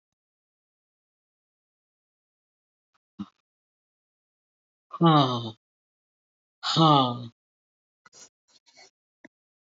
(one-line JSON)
{"exhalation_length": "9.7 s", "exhalation_amplitude": 15813, "exhalation_signal_mean_std_ratio": 0.24, "survey_phase": "beta (2021-08-13 to 2022-03-07)", "age": "65+", "gender": "Female", "wearing_mask": "No", "symptom_none": true, "smoker_status": "Never smoked", "respiratory_condition_asthma": false, "respiratory_condition_other": false, "recruitment_source": "REACT", "submission_delay": "1 day", "covid_test_result": "Negative", "covid_test_method": "RT-qPCR"}